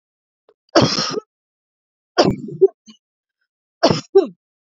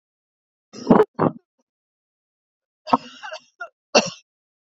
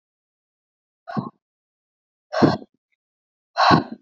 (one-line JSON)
{"three_cough_length": "4.8 s", "three_cough_amplitude": 32263, "three_cough_signal_mean_std_ratio": 0.32, "cough_length": "4.8 s", "cough_amplitude": 32206, "cough_signal_mean_std_ratio": 0.24, "exhalation_length": "4.0 s", "exhalation_amplitude": 27441, "exhalation_signal_mean_std_ratio": 0.29, "survey_phase": "beta (2021-08-13 to 2022-03-07)", "age": "45-64", "gender": "Female", "wearing_mask": "No", "symptom_cough_any": true, "symptom_runny_or_blocked_nose": true, "symptom_fatigue": true, "symptom_onset": "13 days", "smoker_status": "Never smoked", "respiratory_condition_asthma": false, "respiratory_condition_other": false, "recruitment_source": "REACT", "submission_delay": "1 day", "covid_test_result": "Negative", "covid_test_method": "RT-qPCR", "influenza_a_test_result": "Negative", "influenza_b_test_result": "Negative"}